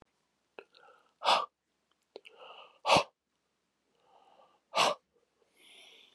exhalation_length: 6.1 s
exhalation_amplitude: 8943
exhalation_signal_mean_std_ratio: 0.25
survey_phase: beta (2021-08-13 to 2022-03-07)
age: 45-64
gender: Male
wearing_mask: 'No'
symptom_runny_or_blocked_nose: true
symptom_headache: true
symptom_onset: 9 days
smoker_status: Never smoked
respiratory_condition_asthma: false
respiratory_condition_other: false
recruitment_source: REACT
submission_delay: 1 day
covid_test_result: Negative
covid_test_method: RT-qPCR
influenza_a_test_result: Negative
influenza_b_test_result: Negative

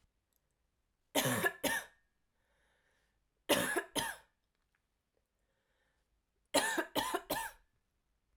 three_cough_length: 8.4 s
three_cough_amplitude: 5290
three_cough_signal_mean_std_ratio: 0.36
survey_phase: alpha (2021-03-01 to 2021-08-12)
age: 18-44
gender: Female
wearing_mask: 'No'
symptom_headache: true
smoker_status: Never smoked
respiratory_condition_asthma: false
respiratory_condition_other: false
recruitment_source: Test and Trace
submission_delay: 1 day
covid_test_result: Positive
covid_test_method: RT-qPCR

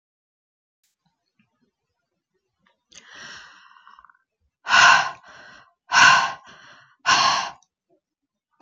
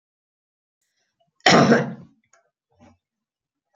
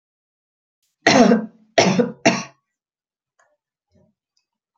exhalation_length: 8.6 s
exhalation_amplitude: 28412
exhalation_signal_mean_std_ratio: 0.3
cough_length: 3.8 s
cough_amplitude: 29489
cough_signal_mean_std_ratio: 0.26
three_cough_length: 4.8 s
three_cough_amplitude: 28442
three_cough_signal_mean_std_ratio: 0.32
survey_phase: beta (2021-08-13 to 2022-03-07)
age: 45-64
gender: Female
wearing_mask: 'No'
symptom_none: true
smoker_status: Never smoked
respiratory_condition_asthma: false
respiratory_condition_other: false
recruitment_source: REACT
submission_delay: 1 day
covid_test_result: Negative
covid_test_method: RT-qPCR
influenza_a_test_result: Negative
influenza_b_test_result: Negative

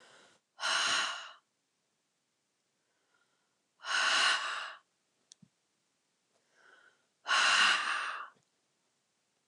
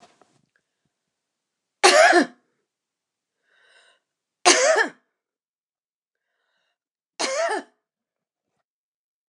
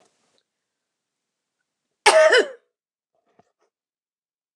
exhalation_length: 9.5 s
exhalation_amplitude: 5742
exhalation_signal_mean_std_ratio: 0.4
three_cough_length: 9.3 s
three_cough_amplitude: 29109
three_cough_signal_mean_std_ratio: 0.27
cough_length: 4.6 s
cough_amplitude: 29203
cough_signal_mean_std_ratio: 0.24
survey_phase: beta (2021-08-13 to 2022-03-07)
age: 45-64
gender: Female
wearing_mask: 'No'
symptom_none: true
smoker_status: Never smoked
respiratory_condition_asthma: false
respiratory_condition_other: false
recruitment_source: REACT
submission_delay: 1 day
covid_test_result: Negative
covid_test_method: RT-qPCR
influenza_a_test_result: Negative
influenza_b_test_result: Negative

